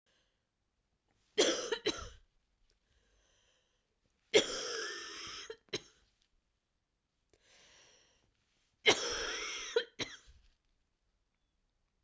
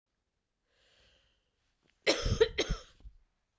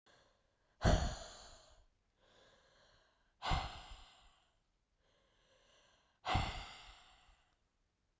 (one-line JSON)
{"three_cough_length": "12.0 s", "three_cough_amplitude": 7314, "three_cough_signal_mean_std_ratio": 0.3, "cough_length": "3.6 s", "cough_amplitude": 8565, "cough_signal_mean_std_ratio": 0.29, "exhalation_length": "8.2 s", "exhalation_amplitude": 3824, "exhalation_signal_mean_std_ratio": 0.29, "survey_phase": "beta (2021-08-13 to 2022-03-07)", "age": "18-44", "gender": "Female", "wearing_mask": "No", "symptom_cough_any": true, "symptom_runny_or_blocked_nose": true, "symptom_fatigue": true, "symptom_headache": true, "smoker_status": "Never smoked", "respiratory_condition_asthma": false, "respiratory_condition_other": false, "recruitment_source": "Test and Trace", "submission_delay": "2 days", "covid_test_result": "Positive", "covid_test_method": "RT-qPCR", "covid_ct_value": 16.2, "covid_ct_gene": "ORF1ab gene", "covid_ct_mean": 16.7, "covid_viral_load": "3400000 copies/ml", "covid_viral_load_category": "High viral load (>1M copies/ml)"}